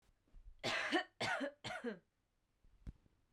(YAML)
three_cough_length: 3.3 s
three_cough_amplitude: 2161
three_cough_signal_mean_std_ratio: 0.48
survey_phase: beta (2021-08-13 to 2022-03-07)
age: 18-44
gender: Female
wearing_mask: 'No'
symptom_runny_or_blocked_nose: true
symptom_sore_throat: true
symptom_fever_high_temperature: true
symptom_headache: true
smoker_status: Current smoker (e-cigarettes or vapes only)
respiratory_condition_asthma: false
respiratory_condition_other: false
recruitment_source: Test and Trace
submission_delay: 1 day
covid_test_result: Positive
covid_test_method: RT-qPCR